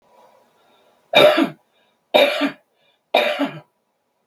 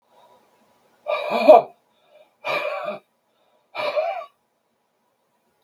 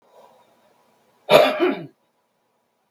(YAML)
three_cough_length: 4.3 s
three_cough_amplitude: 32767
three_cough_signal_mean_std_ratio: 0.38
exhalation_length: 5.6 s
exhalation_amplitude: 32766
exhalation_signal_mean_std_ratio: 0.3
cough_length: 2.9 s
cough_amplitude: 32768
cough_signal_mean_std_ratio: 0.3
survey_phase: beta (2021-08-13 to 2022-03-07)
age: 45-64
gender: Male
wearing_mask: 'No'
symptom_none: true
smoker_status: Ex-smoker
respiratory_condition_asthma: false
respiratory_condition_other: false
recruitment_source: REACT
submission_delay: 3 days
covid_test_result: Negative
covid_test_method: RT-qPCR
influenza_a_test_result: Negative
influenza_b_test_result: Negative